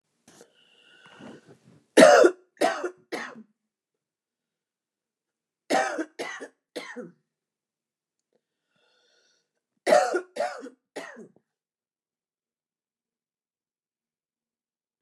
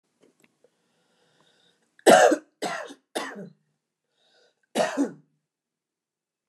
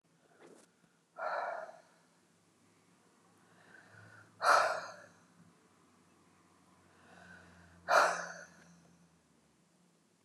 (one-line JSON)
{"three_cough_length": "15.0 s", "three_cough_amplitude": 26679, "three_cough_signal_mean_std_ratio": 0.23, "cough_length": "6.5 s", "cough_amplitude": 24550, "cough_signal_mean_std_ratio": 0.25, "exhalation_length": "10.2 s", "exhalation_amplitude": 6697, "exhalation_signal_mean_std_ratio": 0.28, "survey_phase": "beta (2021-08-13 to 2022-03-07)", "age": "65+", "gender": "Female", "wearing_mask": "No", "symptom_none": true, "smoker_status": "Never smoked", "respiratory_condition_asthma": false, "respiratory_condition_other": false, "recruitment_source": "REACT", "submission_delay": "2 days", "covid_test_result": "Negative", "covid_test_method": "RT-qPCR"}